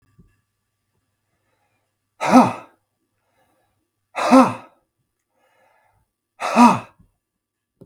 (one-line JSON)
{"exhalation_length": "7.9 s", "exhalation_amplitude": 32768, "exhalation_signal_mean_std_ratio": 0.25, "survey_phase": "beta (2021-08-13 to 2022-03-07)", "age": "45-64", "gender": "Male", "wearing_mask": "No", "symptom_none": true, "smoker_status": "Ex-smoker", "respiratory_condition_asthma": true, "respiratory_condition_other": false, "recruitment_source": "REACT", "submission_delay": "2 days", "covid_test_result": "Negative", "covid_test_method": "RT-qPCR", "influenza_a_test_result": "Negative", "influenza_b_test_result": "Negative"}